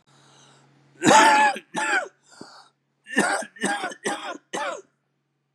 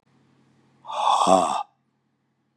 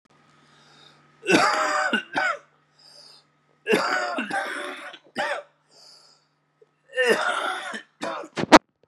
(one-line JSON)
{"cough_length": "5.5 s", "cough_amplitude": 23965, "cough_signal_mean_std_ratio": 0.43, "exhalation_length": "2.6 s", "exhalation_amplitude": 24700, "exhalation_signal_mean_std_ratio": 0.4, "three_cough_length": "8.9 s", "three_cough_amplitude": 32768, "three_cough_signal_mean_std_ratio": 0.42, "survey_phase": "beta (2021-08-13 to 2022-03-07)", "age": "45-64", "gender": "Male", "wearing_mask": "No", "symptom_cough_any": true, "symptom_new_continuous_cough": true, "symptom_runny_or_blocked_nose": true, "symptom_shortness_of_breath": true, "symptom_sore_throat": true, "symptom_fatigue": true, "symptom_fever_high_temperature": true, "symptom_headache": true, "symptom_onset": "4 days", "smoker_status": "Never smoked", "respiratory_condition_asthma": false, "respiratory_condition_other": false, "recruitment_source": "Test and Trace", "submission_delay": "2 days", "covid_test_result": "Positive", "covid_test_method": "RT-qPCR", "covid_ct_value": 30.6, "covid_ct_gene": "N gene", "covid_ct_mean": 31.0, "covid_viral_load": "70 copies/ml", "covid_viral_load_category": "Minimal viral load (< 10K copies/ml)"}